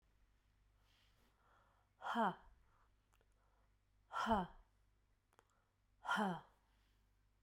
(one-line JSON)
{"exhalation_length": "7.4 s", "exhalation_amplitude": 1802, "exhalation_signal_mean_std_ratio": 0.32, "survey_phase": "beta (2021-08-13 to 2022-03-07)", "age": "45-64", "gender": "Female", "wearing_mask": "No", "symptom_new_continuous_cough": true, "symptom_abdominal_pain": true, "symptom_fatigue": true, "symptom_headache": true, "symptom_onset": "3 days", "smoker_status": "Never smoked", "respiratory_condition_asthma": false, "respiratory_condition_other": false, "recruitment_source": "Test and Trace", "submission_delay": "2 days", "covid_test_result": "Positive", "covid_test_method": "RT-qPCR", "covid_ct_value": 15.7, "covid_ct_gene": "S gene", "covid_ct_mean": 16.1, "covid_viral_load": "5300000 copies/ml", "covid_viral_load_category": "High viral load (>1M copies/ml)"}